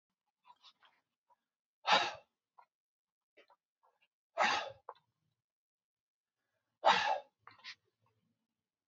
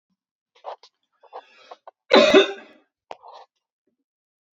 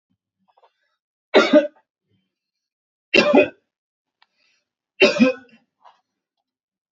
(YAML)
exhalation_length: 8.9 s
exhalation_amplitude: 5882
exhalation_signal_mean_std_ratio: 0.24
cough_length: 4.5 s
cough_amplitude: 32387
cough_signal_mean_std_ratio: 0.24
three_cough_length: 6.9 s
three_cough_amplitude: 27771
three_cough_signal_mean_std_ratio: 0.28
survey_phase: alpha (2021-03-01 to 2021-08-12)
age: 45-64
gender: Male
wearing_mask: 'No'
symptom_none: true
smoker_status: Current smoker (1 to 10 cigarettes per day)
respiratory_condition_asthma: false
respiratory_condition_other: false
recruitment_source: REACT
submission_delay: 3 days
covid_test_result: Negative
covid_test_method: RT-qPCR